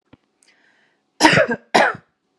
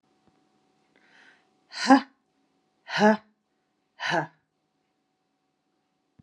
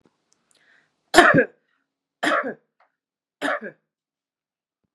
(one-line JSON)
{"cough_length": "2.4 s", "cough_amplitude": 32767, "cough_signal_mean_std_ratio": 0.36, "exhalation_length": "6.2 s", "exhalation_amplitude": 25442, "exhalation_signal_mean_std_ratio": 0.22, "three_cough_length": "4.9 s", "three_cough_amplitude": 32767, "three_cough_signal_mean_std_ratio": 0.27, "survey_phase": "beta (2021-08-13 to 2022-03-07)", "age": "45-64", "gender": "Female", "wearing_mask": "No", "symptom_none": true, "smoker_status": "Never smoked", "respiratory_condition_asthma": false, "respiratory_condition_other": false, "recruitment_source": "REACT", "submission_delay": "1 day", "covid_test_result": "Negative", "covid_test_method": "RT-qPCR"}